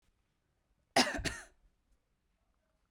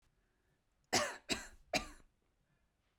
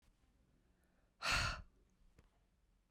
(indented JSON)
{
  "cough_length": "2.9 s",
  "cough_amplitude": 6723,
  "cough_signal_mean_std_ratio": 0.24,
  "three_cough_length": "3.0 s",
  "three_cough_amplitude": 3602,
  "three_cough_signal_mean_std_ratio": 0.31,
  "exhalation_length": "2.9 s",
  "exhalation_amplitude": 2024,
  "exhalation_signal_mean_std_ratio": 0.31,
  "survey_phase": "beta (2021-08-13 to 2022-03-07)",
  "age": "18-44",
  "gender": "Female",
  "wearing_mask": "No",
  "symptom_headache": true,
  "symptom_onset": "12 days",
  "smoker_status": "Never smoked",
  "respiratory_condition_asthma": true,
  "respiratory_condition_other": false,
  "recruitment_source": "REACT",
  "submission_delay": "1 day",
  "covid_test_result": "Negative",
  "covid_test_method": "RT-qPCR",
  "influenza_a_test_result": "Unknown/Void",
  "influenza_b_test_result": "Unknown/Void"
}